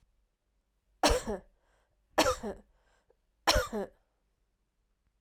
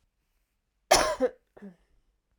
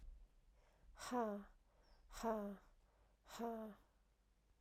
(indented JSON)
{
  "three_cough_length": "5.2 s",
  "three_cough_amplitude": 11091,
  "three_cough_signal_mean_std_ratio": 0.31,
  "cough_length": "2.4 s",
  "cough_amplitude": 17538,
  "cough_signal_mean_std_ratio": 0.29,
  "exhalation_length": "4.6 s",
  "exhalation_amplitude": 980,
  "exhalation_signal_mean_std_ratio": 0.48,
  "survey_phase": "alpha (2021-03-01 to 2021-08-12)",
  "age": "45-64",
  "gender": "Female",
  "wearing_mask": "No",
  "symptom_fatigue": true,
  "symptom_headache": true,
  "symptom_change_to_sense_of_smell_or_taste": true,
  "symptom_onset": "4 days",
  "smoker_status": "Never smoked",
  "respiratory_condition_asthma": false,
  "respiratory_condition_other": false,
  "recruitment_source": "Test and Trace",
  "submission_delay": "2 days",
  "covid_test_result": "Positive",
  "covid_test_method": "RT-qPCR",
  "covid_ct_value": 16.6,
  "covid_ct_gene": "ORF1ab gene"
}